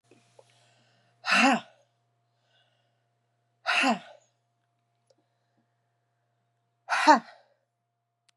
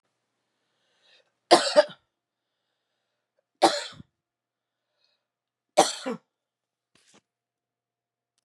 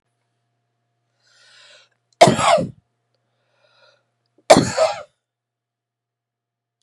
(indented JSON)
{
  "exhalation_length": "8.4 s",
  "exhalation_amplitude": 18657,
  "exhalation_signal_mean_std_ratio": 0.25,
  "three_cough_length": "8.4 s",
  "three_cough_amplitude": 28596,
  "three_cough_signal_mean_std_ratio": 0.19,
  "cough_length": "6.8 s",
  "cough_amplitude": 32768,
  "cough_signal_mean_std_ratio": 0.24,
  "survey_phase": "beta (2021-08-13 to 2022-03-07)",
  "age": "65+",
  "gender": "Female",
  "wearing_mask": "No",
  "symptom_none": true,
  "smoker_status": "Ex-smoker",
  "respiratory_condition_asthma": false,
  "respiratory_condition_other": false,
  "recruitment_source": "REACT",
  "submission_delay": "12 days",
  "covid_test_result": "Negative",
  "covid_test_method": "RT-qPCR",
  "influenza_a_test_result": "Negative",
  "influenza_b_test_result": "Negative"
}